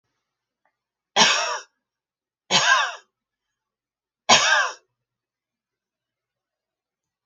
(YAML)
three_cough_length: 7.3 s
three_cough_amplitude: 29147
three_cough_signal_mean_std_ratio: 0.31
survey_phase: beta (2021-08-13 to 2022-03-07)
age: 65+
gender: Female
wearing_mask: 'No'
symptom_none: true
smoker_status: Never smoked
respiratory_condition_asthma: false
respiratory_condition_other: false
recruitment_source: REACT
submission_delay: 1 day
covid_test_result: Negative
covid_test_method: RT-qPCR